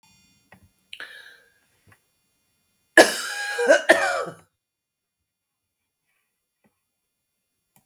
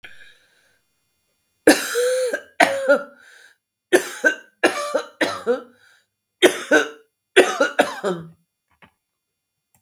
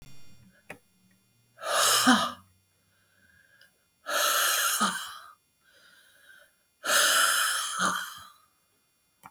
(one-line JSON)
{"cough_length": "7.9 s", "cough_amplitude": 32768, "cough_signal_mean_std_ratio": 0.24, "three_cough_length": "9.8 s", "three_cough_amplitude": 32766, "three_cough_signal_mean_std_ratio": 0.39, "exhalation_length": "9.3 s", "exhalation_amplitude": 14504, "exhalation_signal_mean_std_ratio": 0.48, "survey_phase": "beta (2021-08-13 to 2022-03-07)", "age": "65+", "gender": "Female", "wearing_mask": "No", "symptom_none": true, "smoker_status": "Ex-smoker", "respiratory_condition_asthma": false, "respiratory_condition_other": false, "recruitment_source": "REACT", "submission_delay": "2 days", "covid_test_result": "Negative", "covid_test_method": "RT-qPCR"}